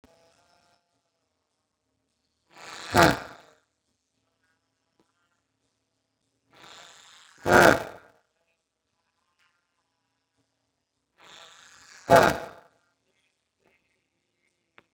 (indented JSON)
{
  "exhalation_length": "14.9 s",
  "exhalation_amplitude": 28911,
  "exhalation_signal_mean_std_ratio": 0.14,
  "survey_phase": "beta (2021-08-13 to 2022-03-07)",
  "age": "45-64",
  "gender": "Male",
  "wearing_mask": "No",
  "symptom_none": true,
  "smoker_status": "Ex-smoker",
  "respiratory_condition_asthma": false,
  "respiratory_condition_other": false,
  "recruitment_source": "REACT",
  "submission_delay": "1 day",
  "covid_test_result": "Negative",
  "covid_test_method": "RT-qPCR",
  "influenza_a_test_result": "Negative",
  "influenza_b_test_result": "Negative"
}